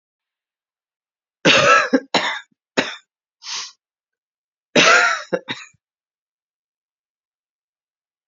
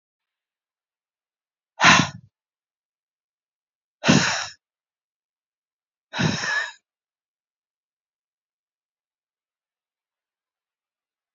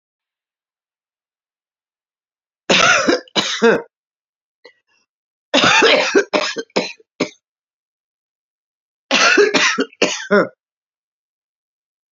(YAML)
cough_length: 8.3 s
cough_amplitude: 30520
cough_signal_mean_std_ratio: 0.32
exhalation_length: 11.3 s
exhalation_amplitude: 27490
exhalation_signal_mean_std_ratio: 0.22
three_cough_length: 12.1 s
three_cough_amplitude: 32515
three_cough_signal_mean_std_ratio: 0.39
survey_phase: beta (2021-08-13 to 2022-03-07)
age: 45-64
gender: Female
wearing_mask: 'No'
symptom_cough_any: true
symptom_runny_or_blocked_nose: true
symptom_shortness_of_breath: true
symptom_fatigue: true
symptom_loss_of_taste: true
symptom_onset: 12 days
smoker_status: Current smoker (11 or more cigarettes per day)
respiratory_condition_asthma: false
respiratory_condition_other: false
recruitment_source: REACT
submission_delay: 3 days
covid_test_result: Negative
covid_test_method: RT-qPCR